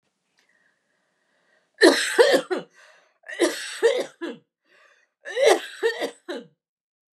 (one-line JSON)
{"three_cough_length": "7.2 s", "three_cough_amplitude": 26549, "three_cough_signal_mean_std_ratio": 0.38, "survey_phase": "beta (2021-08-13 to 2022-03-07)", "age": "65+", "gender": "Female", "wearing_mask": "No", "symptom_none": true, "smoker_status": "Never smoked", "respiratory_condition_asthma": false, "respiratory_condition_other": true, "recruitment_source": "REACT", "submission_delay": "5 days", "covid_test_result": "Negative", "covid_test_method": "RT-qPCR", "influenza_a_test_result": "Negative", "influenza_b_test_result": "Negative"}